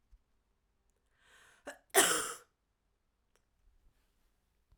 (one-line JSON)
{"cough_length": "4.8 s", "cough_amplitude": 9069, "cough_signal_mean_std_ratio": 0.21, "survey_phase": "alpha (2021-03-01 to 2021-08-12)", "age": "18-44", "gender": "Female", "wearing_mask": "No", "symptom_diarrhoea": true, "symptom_fatigue": true, "symptom_headache": true, "symptom_onset": "3 days", "smoker_status": "Never smoked", "respiratory_condition_asthma": false, "respiratory_condition_other": false, "recruitment_source": "Test and Trace", "submission_delay": "1 day", "covid_test_result": "Positive", "covid_test_method": "RT-qPCR", "covid_ct_value": 28.4, "covid_ct_gene": "N gene"}